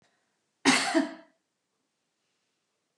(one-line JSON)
{"cough_length": "3.0 s", "cough_amplitude": 13405, "cough_signal_mean_std_ratio": 0.29, "survey_phase": "beta (2021-08-13 to 2022-03-07)", "age": "65+", "gender": "Female", "wearing_mask": "No", "symptom_none": true, "smoker_status": "Ex-smoker", "respiratory_condition_asthma": false, "respiratory_condition_other": false, "recruitment_source": "REACT", "submission_delay": "1 day", "covid_test_result": "Negative", "covid_test_method": "RT-qPCR", "influenza_a_test_result": "Negative", "influenza_b_test_result": "Negative"}